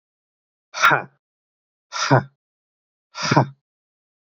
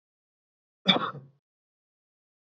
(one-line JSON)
{"exhalation_length": "4.3 s", "exhalation_amplitude": 26574, "exhalation_signal_mean_std_ratio": 0.31, "cough_length": "2.5 s", "cough_amplitude": 16340, "cough_signal_mean_std_ratio": 0.21, "survey_phase": "beta (2021-08-13 to 2022-03-07)", "age": "18-44", "gender": "Male", "wearing_mask": "No", "symptom_runny_or_blocked_nose": true, "symptom_onset": "12 days", "smoker_status": "Ex-smoker", "respiratory_condition_asthma": false, "respiratory_condition_other": false, "recruitment_source": "REACT", "submission_delay": "1 day", "covid_test_result": "Negative", "covid_test_method": "RT-qPCR", "influenza_a_test_result": "Negative", "influenza_b_test_result": "Negative"}